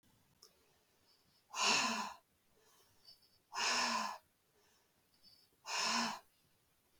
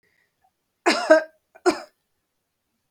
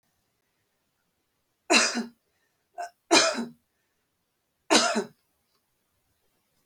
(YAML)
exhalation_length: 7.0 s
exhalation_amplitude: 3360
exhalation_signal_mean_std_ratio: 0.42
cough_length: 2.9 s
cough_amplitude: 31552
cough_signal_mean_std_ratio: 0.28
three_cough_length: 6.7 s
three_cough_amplitude: 18977
three_cough_signal_mean_std_ratio: 0.29
survey_phase: beta (2021-08-13 to 2022-03-07)
age: 45-64
gender: Female
wearing_mask: 'No'
symptom_runny_or_blocked_nose: true
symptom_onset: 7 days
smoker_status: Never smoked
respiratory_condition_asthma: false
respiratory_condition_other: false
recruitment_source: REACT
submission_delay: 2 days
covid_test_result: Negative
covid_test_method: RT-qPCR
influenza_a_test_result: Negative
influenza_b_test_result: Negative